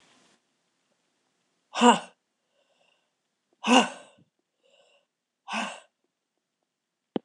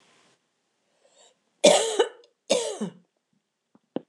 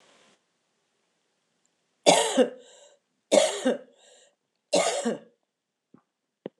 {"exhalation_length": "7.2 s", "exhalation_amplitude": 20553, "exhalation_signal_mean_std_ratio": 0.21, "cough_length": "4.1 s", "cough_amplitude": 25830, "cough_signal_mean_std_ratio": 0.3, "three_cough_length": "6.6 s", "three_cough_amplitude": 25721, "three_cough_signal_mean_std_ratio": 0.32, "survey_phase": "beta (2021-08-13 to 2022-03-07)", "age": "45-64", "gender": "Female", "wearing_mask": "No", "symptom_cough_any": true, "symptom_runny_or_blocked_nose": true, "symptom_fatigue": true, "symptom_headache": true, "symptom_onset": "2 days", "smoker_status": "Never smoked", "respiratory_condition_asthma": false, "respiratory_condition_other": false, "recruitment_source": "Test and Trace", "submission_delay": "2 days", "covid_test_result": "Positive", "covid_test_method": "RT-qPCR", "covid_ct_value": 33.5, "covid_ct_gene": "ORF1ab gene", "covid_ct_mean": 33.9, "covid_viral_load": "7.6 copies/ml", "covid_viral_load_category": "Minimal viral load (< 10K copies/ml)"}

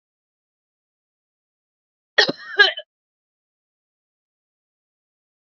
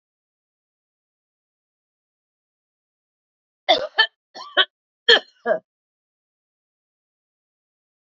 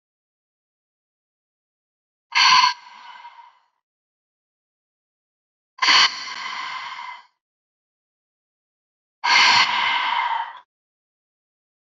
{"cough_length": "5.5 s", "cough_amplitude": 29170, "cough_signal_mean_std_ratio": 0.16, "three_cough_length": "8.0 s", "three_cough_amplitude": 30981, "three_cough_signal_mean_std_ratio": 0.19, "exhalation_length": "11.9 s", "exhalation_amplitude": 25725, "exhalation_signal_mean_std_ratio": 0.35, "survey_phase": "beta (2021-08-13 to 2022-03-07)", "age": "45-64", "gender": "Female", "wearing_mask": "No", "symptom_headache": true, "smoker_status": "Current smoker (11 or more cigarettes per day)", "respiratory_condition_asthma": false, "respiratory_condition_other": false, "recruitment_source": "REACT", "submission_delay": "1 day", "covid_test_result": "Negative", "covid_test_method": "RT-qPCR", "influenza_a_test_result": "Negative", "influenza_b_test_result": "Negative"}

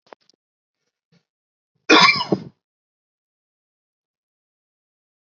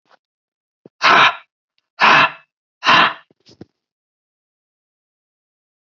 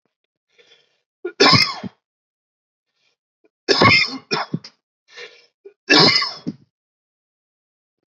{"cough_length": "5.3 s", "cough_amplitude": 30528, "cough_signal_mean_std_ratio": 0.2, "exhalation_length": "6.0 s", "exhalation_amplitude": 30302, "exhalation_signal_mean_std_ratio": 0.31, "three_cough_length": "8.1 s", "three_cough_amplitude": 32767, "three_cough_signal_mean_std_ratio": 0.32, "survey_phase": "beta (2021-08-13 to 2022-03-07)", "age": "18-44", "gender": "Male", "wearing_mask": "No", "symptom_none": true, "smoker_status": "Never smoked", "respiratory_condition_asthma": false, "respiratory_condition_other": false, "recruitment_source": "Test and Trace", "submission_delay": "2 days", "covid_test_result": "Negative", "covid_test_method": "ePCR"}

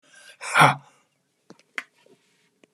{"exhalation_length": "2.7 s", "exhalation_amplitude": 26374, "exhalation_signal_mean_std_ratio": 0.24, "survey_phase": "beta (2021-08-13 to 2022-03-07)", "age": "45-64", "gender": "Male", "wearing_mask": "No", "symptom_shortness_of_breath": true, "symptom_onset": "12 days", "smoker_status": "Never smoked", "respiratory_condition_asthma": true, "respiratory_condition_other": false, "recruitment_source": "REACT", "submission_delay": "1 day", "covid_test_result": "Positive", "covid_test_method": "RT-qPCR", "covid_ct_value": 21.0, "covid_ct_gene": "E gene", "influenza_a_test_result": "Negative", "influenza_b_test_result": "Negative"}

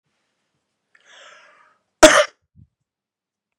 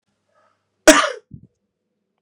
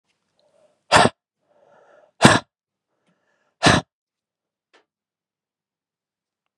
{"cough_length": "3.6 s", "cough_amplitude": 32768, "cough_signal_mean_std_ratio": 0.19, "three_cough_length": "2.2 s", "three_cough_amplitude": 32768, "three_cough_signal_mean_std_ratio": 0.22, "exhalation_length": "6.6 s", "exhalation_amplitude": 32768, "exhalation_signal_mean_std_ratio": 0.21, "survey_phase": "beta (2021-08-13 to 2022-03-07)", "age": "45-64", "gender": "Male", "wearing_mask": "No", "symptom_runny_or_blocked_nose": true, "symptom_shortness_of_breath": true, "symptom_fatigue": true, "symptom_headache": true, "symptom_change_to_sense_of_smell_or_taste": true, "symptom_onset": "2 days", "smoker_status": "Ex-smoker", "respiratory_condition_asthma": false, "respiratory_condition_other": false, "recruitment_source": "Test and Trace", "submission_delay": "2 days", "covid_test_result": "Positive", "covid_test_method": "RT-qPCR", "covid_ct_value": 33.0, "covid_ct_gene": "N gene"}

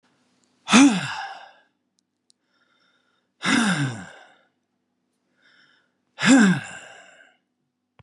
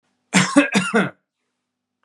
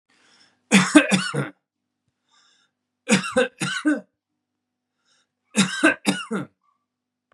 {"exhalation_length": "8.0 s", "exhalation_amplitude": 29288, "exhalation_signal_mean_std_ratio": 0.33, "cough_length": "2.0 s", "cough_amplitude": 32547, "cough_signal_mean_std_ratio": 0.43, "three_cough_length": "7.3 s", "three_cough_amplitude": 32767, "three_cough_signal_mean_std_ratio": 0.36, "survey_phase": "beta (2021-08-13 to 2022-03-07)", "age": "65+", "gender": "Male", "wearing_mask": "No", "symptom_none": true, "smoker_status": "Never smoked", "respiratory_condition_asthma": true, "respiratory_condition_other": false, "recruitment_source": "REACT", "submission_delay": "1 day", "covid_test_result": "Negative", "covid_test_method": "RT-qPCR", "influenza_a_test_result": "Negative", "influenza_b_test_result": "Negative"}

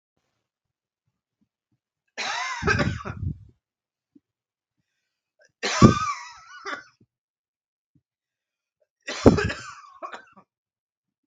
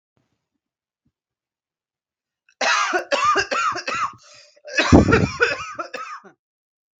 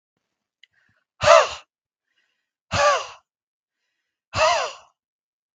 {"three_cough_length": "11.3 s", "three_cough_amplitude": 32768, "three_cough_signal_mean_std_ratio": 0.26, "cough_length": "7.0 s", "cough_amplitude": 32768, "cough_signal_mean_std_ratio": 0.42, "exhalation_length": "5.5 s", "exhalation_amplitude": 32768, "exhalation_signal_mean_std_ratio": 0.3, "survey_phase": "beta (2021-08-13 to 2022-03-07)", "age": "18-44", "gender": "Male", "wearing_mask": "No", "symptom_runny_or_blocked_nose": true, "smoker_status": "Never smoked", "respiratory_condition_asthma": false, "respiratory_condition_other": false, "recruitment_source": "REACT", "submission_delay": "1 day", "covid_test_result": "Negative", "covid_test_method": "RT-qPCR", "influenza_a_test_result": "Negative", "influenza_b_test_result": "Negative"}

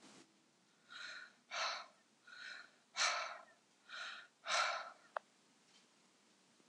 {"exhalation_length": "6.7 s", "exhalation_amplitude": 2465, "exhalation_signal_mean_std_ratio": 0.42, "survey_phase": "beta (2021-08-13 to 2022-03-07)", "age": "65+", "gender": "Female", "wearing_mask": "No", "symptom_none": true, "smoker_status": "Current smoker (11 or more cigarettes per day)", "respiratory_condition_asthma": false, "respiratory_condition_other": false, "recruitment_source": "REACT", "submission_delay": "2 days", "covid_test_result": "Negative", "covid_test_method": "RT-qPCR", "influenza_a_test_result": "Negative", "influenza_b_test_result": "Negative"}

